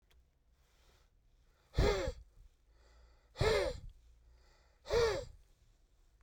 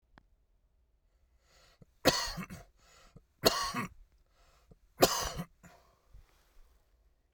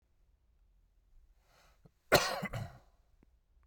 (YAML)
exhalation_length: 6.2 s
exhalation_amplitude: 3703
exhalation_signal_mean_std_ratio: 0.37
three_cough_length: 7.3 s
three_cough_amplitude: 12380
three_cough_signal_mean_std_ratio: 0.28
cough_length: 3.7 s
cough_amplitude: 10938
cough_signal_mean_std_ratio: 0.25
survey_phase: beta (2021-08-13 to 2022-03-07)
age: 18-44
gender: Male
wearing_mask: 'No'
symptom_none: true
smoker_status: Current smoker (11 or more cigarettes per day)
respiratory_condition_asthma: false
respiratory_condition_other: false
recruitment_source: REACT
submission_delay: 1 day
covid_test_result: Negative
covid_test_method: RT-qPCR
influenza_a_test_result: Negative
influenza_b_test_result: Negative